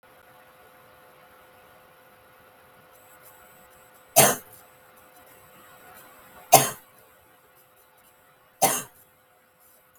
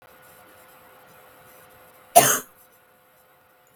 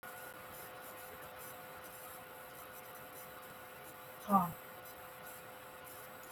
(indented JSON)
{
  "three_cough_length": "10.0 s",
  "three_cough_amplitude": 32768,
  "three_cough_signal_mean_std_ratio": 0.21,
  "cough_length": "3.8 s",
  "cough_amplitude": 32768,
  "cough_signal_mean_std_ratio": 0.21,
  "exhalation_length": "6.3 s",
  "exhalation_amplitude": 4063,
  "exhalation_signal_mean_std_ratio": 0.53,
  "survey_phase": "beta (2021-08-13 to 2022-03-07)",
  "age": "45-64",
  "gender": "Female",
  "wearing_mask": "No",
  "symptom_cough_any": true,
  "symptom_runny_or_blocked_nose": true,
  "symptom_sore_throat": true,
  "symptom_onset": "1 day",
  "smoker_status": "Never smoked",
  "respiratory_condition_asthma": false,
  "respiratory_condition_other": false,
  "recruitment_source": "Test and Trace",
  "submission_delay": "1 day",
  "covid_test_result": "Positive",
  "covid_test_method": "RT-qPCR",
  "covid_ct_value": 19.6,
  "covid_ct_gene": "N gene",
  "covid_ct_mean": 20.2,
  "covid_viral_load": "240000 copies/ml",
  "covid_viral_load_category": "Low viral load (10K-1M copies/ml)"
}